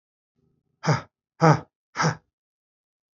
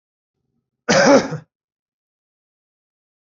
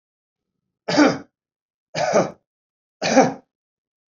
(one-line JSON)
{"exhalation_length": "3.2 s", "exhalation_amplitude": 26555, "exhalation_signal_mean_std_ratio": 0.27, "cough_length": "3.3 s", "cough_amplitude": 31335, "cough_signal_mean_std_ratio": 0.28, "three_cough_length": "4.1 s", "three_cough_amplitude": 27512, "three_cough_signal_mean_std_ratio": 0.35, "survey_phase": "beta (2021-08-13 to 2022-03-07)", "age": "45-64", "gender": "Male", "wearing_mask": "Yes", "symptom_none": true, "smoker_status": "Never smoked", "respiratory_condition_asthma": false, "respiratory_condition_other": false, "recruitment_source": "REACT", "submission_delay": "3 days", "covid_test_result": "Negative", "covid_test_method": "RT-qPCR"}